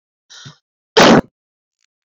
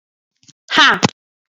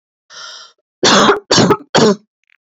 {"cough_length": "2.0 s", "cough_amplitude": 31751, "cough_signal_mean_std_ratio": 0.3, "exhalation_length": "1.5 s", "exhalation_amplitude": 32768, "exhalation_signal_mean_std_ratio": 0.34, "three_cough_length": "2.6 s", "three_cough_amplitude": 31714, "three_cough_signal_mean_std_ratio": 0.51, "survey_phase": "beta (2021-08-13 to 2022-03-07)", "age": "18-44", "gender": "Female", "wearing_mask": "No", "symptom_sore_throat": true, "symptom_onset": "8 days", "smoker_status": "Never smoked", "respiratory_condition_asthma": false, "respiratory_condition_other": false, "recruitment_source": "REACT", "submission_delay": "3 days", "covid_test_result": "Negative", "covid_test_method": "RT-qPCR", "influenza_a_test_result": "Negative", "influenza_b_test_result": "Negative"}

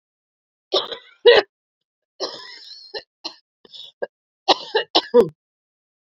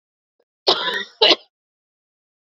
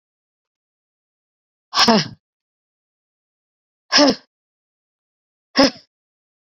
{"three_cough_length": "6.1 s", "three_cough_amplitude": 28855, "three_cough_signal_mean_std_ratio": 0.28, "cough_length": "2.5 s", "cough_amplitude": 31393, "cough_signal_mean_std_ratio": 0.31, "exhalation_length": "6.6 s", "exhalation_amplitude": 31147, "exhalation_signal_mean_std_ratio": 0.24, "survey_phase": "beta (2021-08-13 to 2022-03-07)", "age": "18-44", "gender": "Female", "wearing_mask": "No", "symptom_cough_any": true, "symptom_runny_or_blocked_nose": true, "symptom_shortness_of_breath": true, "symptom_sore_throat": true, "symptom_diarrhoea": true, "symptom_fatigue": true, "symptom_headache": true, "symptom_change_to_sense_of_smell_or_taste": true, "symptom_loss_of_taste": true, "symptom_onset": "7 days", "smoker_status": "Never smoked", "respiratory_condition_asthma": true, "respiratory_condition_other": false, "recruitment_source": "Test and Trace", "submission_delay": "2 days", "covid_test_result": "Positive", "covid_test_method": "RT-qPCR"}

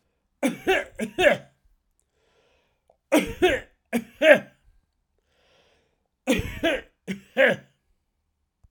{"three_cough_length": "8.7 s", "three_cough_amplitude": 30910, "three_cough_signal_mean_std_ratio": 0.34, "survey_phase": "alpha (2021-03-01 to 2021-08-12)", "age": "65+", "gender": "Male", "wearing_mask": "No", "symptom_none": true, "smoker_status": "Ex-smoker", "respiratory_condition_asthma": false, "respiratory_condition_other": false, "recruitment_source": "Test and Trace", "submission_delay": "1 day", "covid_test_result": "Positive", "covid_test_method": "RT-qPCR"}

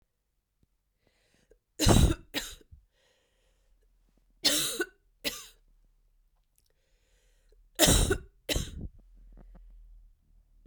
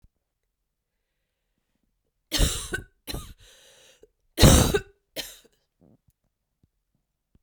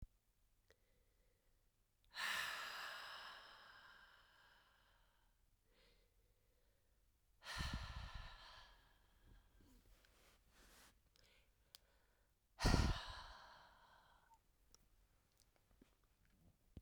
{"three_cough_length": "10.7 s", "three_cough_amplitude": 16704, "three_cough_signal_mean_std_ratio": 0.3, "cough_length": "7.4 s", "cough_amplitude": 32768, "cough_signal_mean_std_ratio": 0.24, "exhalation_length": "16.8 s", "exhalation_amplitude": 2638, "exhalation_signal_mean_std_ratio": 0.3, "survey_phase": "beta (2021-08-13 to 2022-03-07)", "age": "18-44", "gender": "Female", "wearing_mask": "No", "symptom_cough_any": true, "symptom_runny_or_blocked_nose": true, "symptom_sore_throat": true, "symptom_fatigue": true, "symptom_headache": true, "symptom_onset": "4 days", "smoker_status": "Never smoked", "respiratory_condition_asthma": false, "respiratory_condition_other": false, "recruitment_source": "Test and Trace", "submission_delay": "2 days", "covid_test_result": "Positive", "covid_test_method": "RT-qPCR"}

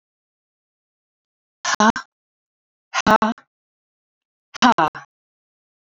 {"exhalation_length": "6.0 s", "exhalation_amplitude": 32767, "exhalation_signal_mean_std_ratio": 0.25, "survey_phase": "beta (2021-08-13 to 2022-03-07)", "age": "45-64", "gender": "Female", "wearing_mask": "No", "symptom_cough_any": true, "symptom_runny_or_blocked_nose": true, "symptom_onset": "12 days", "smoker_status": "Ex-smoker", "respiratory_condition_asthma": false, "respiratory_condition_other": true, "recruitment_source": "REACT", "submission_delay": "1 day", "covid_test_result": "Negative", "covid_test_method": "RT-qPCR"}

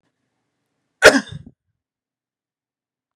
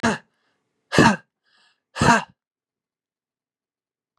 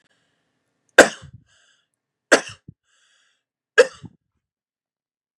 {"cough_length": "3.2 s", "cough_amplitude": 32768, "cough_signal_mean_std_ratio": 0.17, "exhalation_length": "4.2 s", "exhalation_amplitude": 31773, "exhalation_signal_mean_std_ratio": 0.28, "three_cough_length": "5.4 s", "three_cough_amplitude": 32768, "three_cough_signal_mean_std_ratio": 0.16, "survey_phase": "beta (2021-08-13 to 2022-03-07)", "age": "18-44", "gender": "Male", "wearing_mask": "No", "symptom_none": true, "smoker_status": "Never smoked", "respiratory_condition_asthma": false, "respiratory_condition_other": false, "recruitment_source": "REACT", "submission_delay": "2 days", "covid_test_result": "Negative", "covid_test_method": "RT-qPCR", "influenza_a_test_result": "Negative", "influenza_b_test_result": "Negative"}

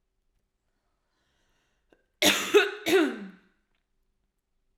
{"cough_length": "4.8 s", "cough_amplitude": 14183, "cough_signal_mean_std_ratio": 0.31, "survey_phase": "beta (2021-08-13 to 2022-03-07)", "age": "18-44", "gender": "Female", "wearing_mask": "No", "symptom_cough_any": true, "symptom_new_continuous_cough": true, "symptom_runny_or_blocked_nose": true, "symptom_shortness_of_breath": true, "symptom_fatigue": true, "smoker_status": "Ex-smoker", "respiratory_condition_asthma": false, "respiratory_condition_other": false, "recruitment_source": "Test and Trace", "submission_delay": "2 days", "covid_test_result": "Positive", "covid_test_method": "LFT"}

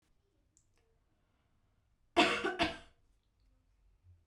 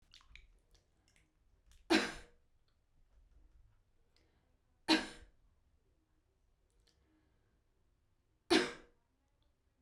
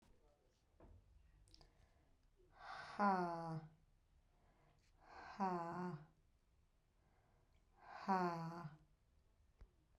{"cough_length": "4.3 s", "cough_amplitude": 5611, "cough_signal_mean_std_ratio": 0.26, "three_cough_length": "9.8 s", "three_cough_amplitude": 5883, "three_cough_signal_mean_std_ratio": 0.21, "exhalation_length": "10.0 s", "exhalation_amplitude": 1631, "exhalation_signal_mean_std_ratio": 0.4, "survey_phase": "beta (2021-08-13 to 2022-03-07)", "age": "18-44", "gender": "Female", "wearing_mask": "No", "symptom_none": true, "smoker_status": "Ex-smoker", "respiratory_condition_asthma": false, "respiratory_condition_other": false, "recruitment_source": "REACT", "submission_delay": "3 days", "covid_test_result": "Negative", "covid_test_method": "RT-qPCR"}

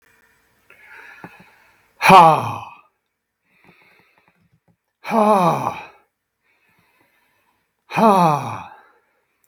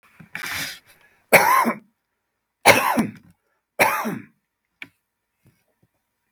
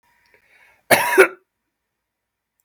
{"exhalation_length": "9.5 s", "exhalation_amplitude": 32768, "exhalation_signal_mean_std_ratio": 0.31, "three_cough_length": "6.3 s", "three_cough_amplitude": 32768, "three_cough_signal_mean_std_ratio": 0.34, "cough_length": "2.6 s", "cough_amplitude": 32768, "cough_signal_mean_std_ratio": 0.26, "survey_phase": "beta (2021-08-13 to 2022-03-07)", "age": "65+", "gender": "Male", "wearing_mask": "No", "symptom_cough_any": true, "smoker_status": "Never smoked", "respiratory_condition_asthma": false, "respiratory_condition_other": false, "recruitment_source": "REACT", "submission_delay": "1 day", "covid_test_result": "Negative", "covid_test_method": "RT-qPCR"}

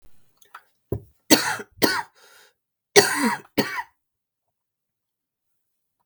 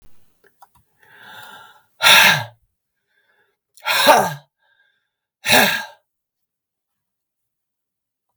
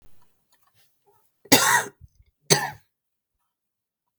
{"three_cough_length": "6.1 s", "three_cough_amplitude": 32768, "three_cough_signal_mean_std_ratio": 0.29, "exhalation_length": "8.4 s", "exhalation_amplitude": 32768, "exhalation_signal_mean_std_ratio": 0.3, "cough_length": "4.2 s", "cough_amplitude": 32768, "cough_signal_mean_std_ratio": 0.26, "survey_phase": "beta (2021-08-13 to 2022-03-07)", "age": "45-64", "gender": "Female", "wearing_mask": "No", "symptom_cough_any": true, "symptom_runny_or_blocked_nose": true, "symptom_sore_throat": true, "smoker_status": "Never smoked", "respiratory_condition_asthma": false, "respiratory_condition_other": false, "recruitment_source": "Test and Trace", "submission_delay": "2 days", "covid_test_result": "Positive", "covid_test_method": "RT-qPCR", "covid_ct_value": 21.2, "covid_ct_gene": "ORF1ab gene", "covid_ct_mean": 21.4, "covid_viral_load": "94000 copies/ml", "covid_viral_load_category": "Low viral load (10K-1M copies/ml)"}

